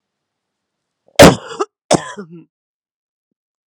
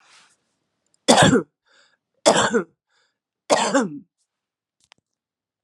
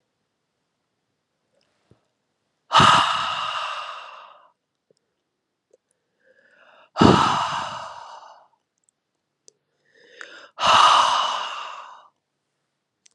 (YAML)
cough_length: 3.7 s
cough_amplitude: 32768
cough_signal_mean_std_ratio: 0.23
three_cough_length: 5.6 s
three_cough_amplitude: 32360
three_cough_signal_mean_std_ratio: 0.34
exhalation_length: 13.1 s
exhalation_amplitude: 32209
exhalation_signal_mean_std_ratio: 0.34
survey_phase: beta (2021-08-13 to 2022-03-07)
age: 45-64
gender: Female
wearing_mask: 'No'
symptom_cough_any: true
symptom_new_continuous_cough: true
symptom_runny_or_blocked_nose: true
symptom_shortness_of_breath: true
symptom_sore_throat: true
symptom_abdominal_pain: true
symptom_fatigue: true
symptom_fever_high_temperature: true
symptom_headache: true
symptom_change_to_sense_of_smell_or_taste: true
symptom_other: true
symptom_onset: 4 days
smoker_status: Never smoked
respiratory_condition_asthma: false
respiratory_condition_other: false
recruitment_source: Test and Trace
submission_delay: 2 days
covid_test_result: Positive
covid_test_method: ePCR